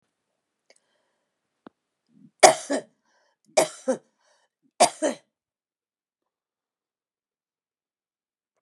{"three_cough_length": "8.6 s", "three_cough_amplitude": 32768, "three_cough_signal_mean_std_ratio": 0.18, "survey_phase": "beta (2021-08-13 to 2022-03-07)", "age": "65+", "gender": "Female", "wearing_mask": "No", "symptom_none": true, "smoker_status": "Ex-smoker", "respiratory_condition_asthma": false, "respiratory_condition_other": false, "recruitment_source": "REACT", "submission_delay": "5 days", "covid_test_result": "Negative", "covid_test_method": "RT-qPCR", "influenza_a_test_result": "Negative", "influenza_b_test_result": "Negative"}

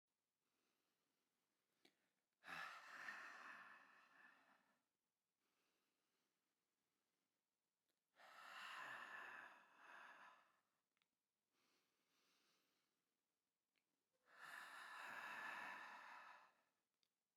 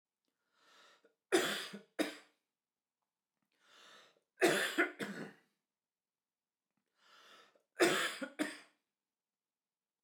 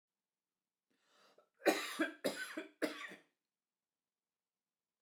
{"exhalation_length": "17.4 s", "exhalation_amplitude": 287, "exhalation_signal_mean_std_ratio": 0.48, "three_cough_length": "10.0 s", "three_cough_amplitude": 5067, "three_cough_signal_mean_std_ratio": 0.31, "cough_length": "5.0 s", "cough_amplitude": 4348, "cough_signal_mean_std_ratio": 0.3, "survey_phase": "beta (2021-08-13 to 2022-03-07)", "age": "45-64", "gender": "Male", "wearing_mask": "No", "symptom_none": true, "smoker_status": "Never smoked", "respiratory_condition_asthma": false, "respiratory_condition_other": false, "recruitment_source": "REACT", "submission_delay": "1 day", "covid_test_result": "Negative", "covid_test_method": "RT-qPCR"}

